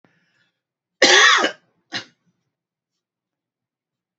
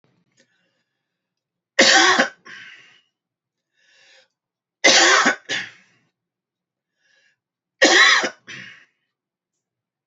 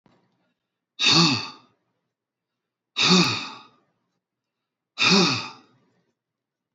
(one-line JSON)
{"cough_length": "4.2 s", "cough_amplitude": 32537, "cough_signal_mean_std_ratio": 0.28, "three_cough_length": "10.1 s", "three_cough_amplitude": 30678, "three_cough_signal_mean_std_ratio": 0.32, "exhalation_length": "6.7 s", "exhalation_amplitude": 17455, "exhalation_signal_mean_std_ratio": 0.36, "survey_phase": "beta (2021-08-13 to 2022-03-07)", "age": "45-64", "gender": "Male", "wearing_mask": "No", "symptom_none": true, "smoker_status": "Never smoked", "respiratory_condition_asthma": false, "respiratory_condition_other": false, "recruitment_source": "REACT", "submission_delay": "3 days", "covid_test_result": "Negative", "covid_test_method": "RT-qPCR", "influenza_a_test_result": "Unknown/Void", "influenza_b_test_result": "Unknown/Void"}